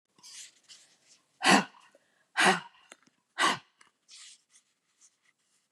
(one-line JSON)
{"exhalation_length": "5.7 s", "exhalation_amplitude": 13115, "exhalation_signal_mean_std_ratio": 0.27, "survey_phase": "beta (2021-08-13 to 2022-03-07)", "age": "45-64", "gender": "Female", "wearing_mask": "No", "symptom_fatigue": true, "smoker_status": "Never smoked", "respiratory_condition_asthma": false, "respiratory_condition_other": false, "recruitment_source": "REACT", "submission_delay": "1 day", "covid_test_result": "Negative", "covid_test_method": "RT-qPCR", "influenza_a_test_result": "Negative", "influenza_b_test_result": "Negative"}